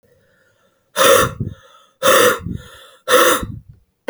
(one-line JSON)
{"exhalation_length": "4.1 s", "exhalation_amplitude": 32768, "exhalation_signal_mean_std_ratio": 0.46, "survey_phase": "beta (2021-08-13 to 2022-03-07)", "age": "18-44", "gender": "Female", "wearing_mask": "No", "symptom_cough_any": true, "symptom_runny_or_blocked_nose": true, "symptom_sore_throat": true, "symptom_onset": "4 days", "smoker_status": "Never smoked", "respiratory_condition_asthma": false, "respiratory_condition_other": false, "recruitment_source": "REACT", "submission_delay": "0 days", "covid_test_result": "Negative", "covid_test_method": "RT-qPCR"}